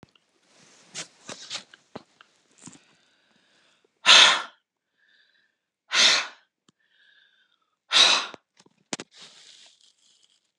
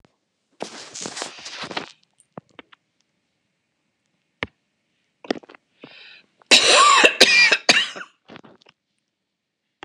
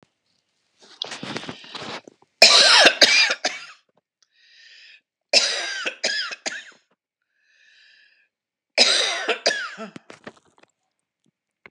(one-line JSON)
{"exhalation_length": "10.6 s", "exhalation_amplitude": 28883, "exhalation_signal_mean_std_ratio": 0.25, "cough_length": "9.8 s", "cough_amplitude": 32768, "cough_signal_mean_std_ratio": 0.31, "three_cough_length": "11.7 s", "three_cough_amplitude": 32768, "three_cough_signal_mean_std_ratio": 0.35, "survey_phase": "beta (2021-08-13 to 2022-03-07)", "age": "65+", "gender": "Female", "wearing_mask": "No", "symptom_none": true, "smoker_status": "Never smoked", "respiratory_condition_asthma": false, "respiratory_condition_other": false, "recruitment_source": "REACT", "submission_delay": "2 days", "covid_test_result": "Negative", "covid_test_method": "RT-qPCR"}